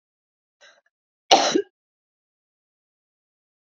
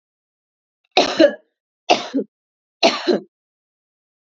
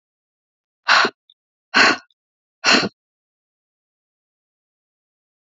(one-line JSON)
{"cough_length": "3.7 s", "cough_amplitude": 32767, "cough_signal_mean_std_ratio": 0.2, "three_cough_length": "4.4 s", "three_cough_amplitude": 32768, "three_cough_signal_mean_std_ratio": 0.32, "exhalation_length": "5.5 s", "exhalation_amplitude": 28062, "exhalation_signal_mean_std_ratio": 0.27, "survey_phase": "beta (2021-08-13 to 2022-03-07)", "age": "18-44", "gender": "Female", "wearing_mask": "No", "symptom_none": true, "smoker_status": "Never smoked", "respiratory_condition_asthma": false, "respiratory_condition_other": false, "recruitment_source": "REACT", "submission_delay": "1 day", "covid_test_result": "Negative", "covid_test_method": "RT-qPCR", "influenza_a_test_result": "Negative", "influenza_b_test_result": "Negative"}